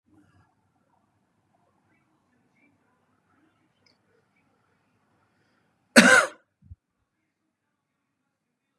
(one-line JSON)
{"cough_length": "8.8 s", "cough_amplitude": 32767, "cough_signal_mean_std_ratio": 0.15, "survey_phase": "beta (2021-08-13 to 2022-03-07)", "age": "45-64", "gender": "Male", "wearing_mask": "No", "symptom_none": true, "smoker_status": "Never smoked", "respiratory_condition_asthma": false, "respiratory_condition_other": false, "recruitment_source": "REACT", "submission_delay": "1 day", "covid_test_result": "Negative", "covid_test_method": "RT-qPCR", "influenza_a_test_result": "Negative", "influenza_b_test_result": "Negative"}